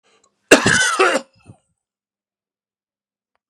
{"cough_length": "3.5 s", "cough_amplitude": 32768, "cough_signal_mean_std_ratio": 0.32, "survey_phase": "beta (2021-08-13 to 2022-03-07)", "age": "45-64", "gender": "Male", "wearing_mask": "No", "symptom_runny_or_blocked_nose": true, "symptom_fatigue": true, "symptom_onset": "12 days", "smoker_status": "Never smoked", "respiratory_condition_asthma": false, "respiratory_condition_other": false, "recruitment_source": "REACT", "submission_delay": "2 days", "covid_test_result": "Negative", "covid_test_method": "RT-qPCR", "influenza_a_test_result": "Negative", "influenza_b_test_result": "Negative"}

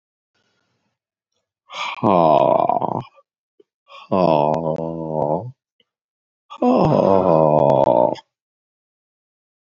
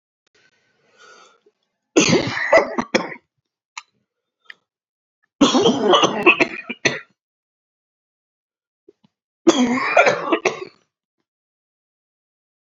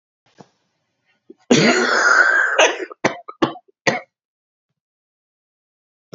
{"exhalation_length": "9.7 s", "exhalation_amplitude": 31644, "exhalation_signal_mean_std_ratio": 0.45, "three_cough_length": "12.6 s", "three_cough_amplitude": 29088, "three_cough_signal_mean_std_ratio": 0.37, "cough_length": "6.1 s", "cough_amplitude": 28924, "cough_signal_mean_std_ratio": 0.41, "survey_phase": "beta (2021-08-13 to 2022-03-07)", "age": "45-64", "gender": "Male", "wearing_mask": "No", "symptom_cough_any": true, "symptom_sore_throat": true, "symptom_fatigue": true, "symptom_headache": true, "symptom_onset": "3 days", "smoker_status": "Ex-smoker", "respiratory_condition_asthma": false, "respiratory_condition_other": false, "recruitment_source": "Test and Trace", "submission_delay": "1 day", "covid_test_result": "Positive", "covid_test_method": "RT-qPCR", "covid_ct_value": 21.3, "covid_ct_gene": "S gene", "covid_ct_mean": 21.6, "covid_viral_load": "84000 copies/ml", "covid_viral_load_category": "Low viral load (10K-1M copies/ml)"}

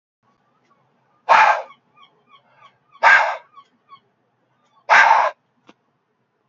{"exhalation_length": "6.5 s", "exhalation_amplitude": 29908, "exhalation_signal_mean_std_ratio": 0.32, "survey_phase": "beta (2021-08-13 to 2022-03-07)", "age": "45-64", "gender": "Male", "wearing_mask": "No", "symptom_cough_any": true, "symptom_sore_throat": true, "symptom_headache": true, "smoker_status": "Ex-smoker", "respiratory_condition_asthma": false, "respiratory_condition_other": false, "recruitment_source": "Test and Trace", "submission_delay": "1 day", "covid_test_result": "Positive", "covid_test_method": "RT-qPCR", "covid_ct_value": 27.2, "covid_ct_gene": "N gene"}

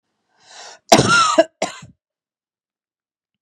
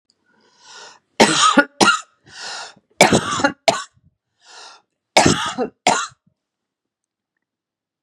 {"cough_length": "3.4 s", "cough_amplitude": 32768, "cough_signal_mean_std_ratio": 0.32, "three_cough_length": "8.0 s", "three_cough_amplitude": 32768, "three_cough_signal_mean_std_ratio": 0.36, "survey_phase": "beta (2021-08-13 to 2022-03-07)", "age": "45-64", "gender": "Female", "wearing_mask": "No", "symptom_cough_any": true, "symptom_sore_throat": true, "symptom_fatigue": true, "symptom_headache": true, "smoker_status": "Ex-smoker", "respiratory_condition_asthma": false, "respiratory_condition_other": false, "recruitment_source": "REACT", "submission_delay": "4 days", "covid_test_result": "Negative", "covid_test_method": "RT-qPCR", "influenza_a_test_result": "Negative", "influenza_b_test_result": "Negative"}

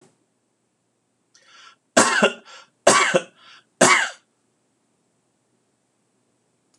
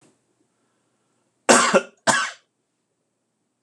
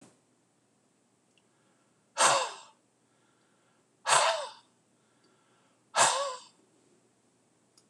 {"three_cough_length": "6.8 s", "three_cough_amplitude": 26028, "three_cough_signal_mean_std_ratio": 0.29, "cough_length": "3.6 s", "cough_amplitude": 26028, "cough_signal_mean_std_ratio": 0.28, "exhalation_length": "7.9 s", "exhalation_amplitude": 12131, "exhalation_signal_mean_std_ratio": 0.29, "survey_phase": "beta (2021-08-13 to 2022-03-07)", "age": "45-64", "gender": "Male", "wearing_mask": "No", "symptom_none": true, "smoker_status": "Ex-smoker", "respiratory_condition_asthma": false, "respiratory_condition_other": false, "recruitment_source": "REACT", "submission_delay": "1 day", "covid_test_result": "Negative", "covid_test_method": "RT-qPCR"}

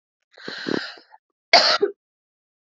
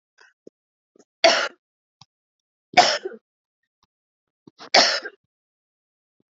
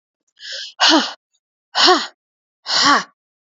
{"cough_length": "2.6 s", "cough_amplitude": 30124, "cough_signal_mean_std_ratio": 0.33, "three_cough_length": "6.3 s", "three_cough_amplitude": 32767, "three_cough_signal_mean_std_ratio": 0.25, "exhalation_length": "3.6 s", "exhalation_amplitude": 32767, "exhalation_signal_mean_std_ratio": 0.42, "survey_phase": "beta (2021-08-13 to 2022-03-07)", "age": "18-44", "gender": "Female", "wearing_mask": "No", "symptom_none": true, "symptom_onset": "12 days", "smoker_status": "Current smoker (e-cigarettes or vapes only)", "respiratory_condition_asthma": false, "respiratory_condition_other": false, "recruitment_source": "REACT", "submission_delay": "2 days", "covid_test_result": "Positive", "covid_test_method": "RT-qPCR", "covid_ct_value": 32.4, "covid_ct_gene": "N gene", "influenza_a_test_result": "Negative", "influenza_b_test_result": "Negative"}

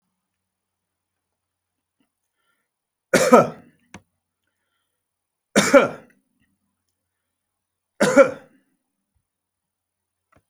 {"three_cough_length": "10.5 s", "three_cough_amplitude": 32768, "three_cough_signal_mean_std_ratio": 0.21, "survey_phase": "beta (2021-08-13 to 2022-03-07)", "age": "65+", "gender": "Male", "wearing_mask": "No", "symptom_none": true, "smoker_status": "Never smoked", "respiratory_condition_asthma": false, "respiratory_condition_other": false, "recruitment_source": "REACT", "submission_delay": "2 days", "covid_test_result": "Negative", "covid_test_method": "RT-qPCR", "influenza_a_test_result": "Negative", "influenza_b_test_result": "Negative"}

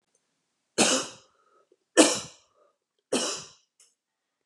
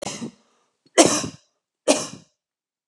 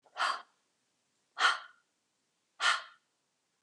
{"three_cough_length": "4.5 s", "three_cough_amplitude": 22880, "three_cough_signal_mean_std_ratio": 0.29, "cough_length": "2.9 s", "cough_amplitude": 32711, "cough_signal_mean_std_ratio": 0.3, "exhalation_length": "3.6 s", "exhalation_amplitude": 6943, "exhalation_signal_mean_std_ratio": 0.32, "survey_phase": "beta (2021-08-13 to 2022-03-07)", "age": "45-64", "gender": "Female", "wearing_mask": "No", "symptom_none": true, "smoker_status": "Never smoked", "respiratory_condition_asthma": false, "respiratory_condition_other": false, "recruitment_source": "REACT", "submission_delay": "0 days", "covid_test_result": "Negative", "covid_test_method": "RT-qPCR", "influenza_a_test_result": "Negative", "influenza_b_test_result": "Negative"}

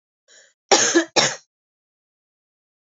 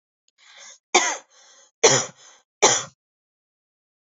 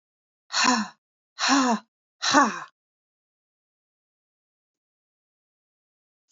{"cough_length": "2.8 s", "cough_amplitude": 29618, "cough_signal_mean_std_ratio": 0.32, "three_cough_length": "4.0 s", "three_cough_amplitude": 29333, "three_cough_signal_mean_std_ratio": 0.3, "exhalation_length": "6.3 s", "exhalation_amplitude": 18510, "exhalation_signal_mean_std_ratio": 0.31, "survey_phase": "alpha (2021-03-01 to 2021-08-12)", "age": "18-44", "gender": "Female", "wearing_mask": "No", "symptom_none": true, "smoker_status": "Current smoker (e-cigarettes or vapes only)", "respiratory_condition_asthma": false, "respiratory_condition_other": false, "recruitment_source": "REACT", "submission_delay": "1 day", "covid_test_result": "Negative", "covid_test_method": "RT-qPCR"}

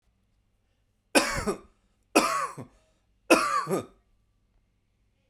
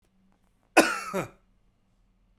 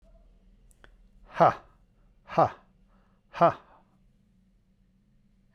{"three_cough_length": "5.3 s", "three_cough_amplitude": 24271, "three_cough_signal_mean_std_ratio": 0.35, "cough_length": "2.4 s", "cough_amplitude": 21120, "cough_signal_mean_std_ratio": 0.26, "exhalation_length": "5.5 s", "exhalation_amplitude": 14195, "exhalation_signal_mean_std_ratio": 0.23, "survey_phase": "beta (2021-08-13 to 2022-03-07)", "age": "45-64", "gender": "Male", "wearing_mask": "No", "symptom_none": true, "smoker_status": "Never smoked", "respiratory_condition_asthma": false, "respiratory_condition_other": false, "recruitment_source": "REACT", "submission_delay": "1 day", "covid_test_result": "Negative", "covid_test_method": "RT-qPCR"}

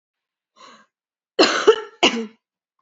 {"cough_length": "2.8 s", "cough_amplitude": 29018, "cough_signal_mean_std_ratio": 0.32, "survey_phase": "alpha (2021-03-01 to 2021-08-12)", "age": "18-44", "gender": "Female", "wearing_mask": "No", "symptom_cough_any": true, "symptom_fatigue": true, "symptom_headache": true, "symptom_change_to_sense_of_smell_or_taste": true, "symptom_loss_of_taste": true, "symptom_onset": "4 days", "smoker_status": "Never smoked", "respiratory_condition_asthma": false, "respiratory_condition_other": false, "recruitment_source": "Test and Trace", "submission_delay": "2 days", "covid_test_result": "Positive", "covid_test_method": "RT-qPCR", "covid_ct_value": 22.8, "covid_ct_gene": "N gene", "covid_ct_mean": 22.9, "covid_viral_load": "30000 copies/ml", "covid_viral_load_category": "Low viral load (10K-1M copies/ml)"}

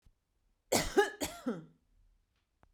{"cough_length": "2.7 s", "cough_amplitude": 7542, "cough_signal_mean_std_ratio": 0.33, "survey_phase": "beta (2021-08-13 to 2022-03-07)", "age": "45-64", "gender": "Female", "wearing_mask": "No", "symptom_none": true, "smoker_status": "Ex-smoker", "respiratory_condition_asthma": false, "respiratory_condition_other": false, "recruitment_source": "REACT", "submission_delay": "0 days", "covid_test_result": "Negative", "covid_test_method": "RT-qPCR"}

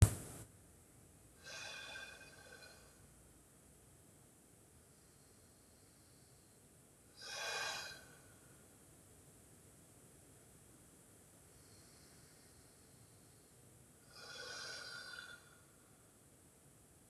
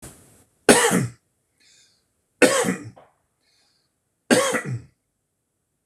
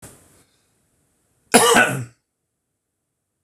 {"exhalation_length": "17.1 s", "exhalation_amplitude": 11475, "exhalation_signal_mean_std_ratio": 0.28, "three_cough_length": "5.9 s", "three_cough_amplitude": 26028, "three_cough_signal_mean_std_ratio": 0.33, "cough_length": "3.4 s", "cough_amplitude": 26028, "cough_signal_mean_std_ratio": 0.28, "survey_phase": "beta (2021-08-13 to 2022-03-07)", "age": "45-64", "gender": "Male", "wearing_mask": "No", "symptom_none": true, "smoker_status": "Ex-smoker", "respiratory_condition_asthma": false, "respiratory_condition_other": true, "recruitment_source": "REACT", "submission_delay": "10 days", "covid_test_result": "Negative", "covid_test_method": "RT-qPCR"}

